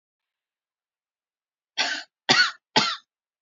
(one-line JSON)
{"three_cough_length": "3.4 s", "three_cough_amplitude": 20632, "three_cough_signal_mean_std_ratio": 0.31, "survey_phase": "alpha (2021-03-01 to 2021-08-12)", "age": "18-44", "gender": "Female", "wearing_mask": "No", "symptom_none": true, "symptom_onset": "12 days", "smoker_status": "Never smoked", "respiratory_condition_asthma": false, "respiratory_condition_other": false, "recruitment_source": "REACT", "submission_delay": "9 days", "covid_test_result": "Negative", "covid_test_method": "RT-qPCR"}